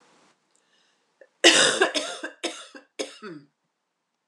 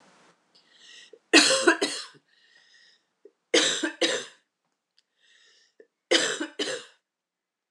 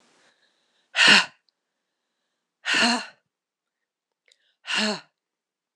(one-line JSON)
{"cough_length": "4.3 s", "cough_amplitude": 26028, "cough_signal_mean_std_ratio": 0.32, "three_cough_length": "7.7 s", "three_cough_amplitude": 24613, "three_cough_signal_mean_std_ratio": 0.34, "exhalation_length": "5.8 s", "exhalation_amplitude": 25560, "exhalation_signal_mean_std_ratio": 0.29, "survey_phase": "alpha (2021-03-01 to 2021-08-12)", "age": "45-64", "gender": "Female", "wearing_mask": "No", "symptom_fever_high_temperature": true, "symptom_headache": true, "symptom_change_to_sense_of_smell_or_taste": true, "symptom_loss_of_taste": true, "symptom_onset": "4 days", "smoker_status": "Never smoked", "respiratory_condition_asthma": false, "respiratory_condition_other": false, "recruitment_source": "Test and Trace", "submission_delay": "2 days", "covid_test_result": "Positive", "covid_test_method": "RT-qPCR", "covid_ct_value": 21.0, "covid_ct_gene": "ORF1ab gene"}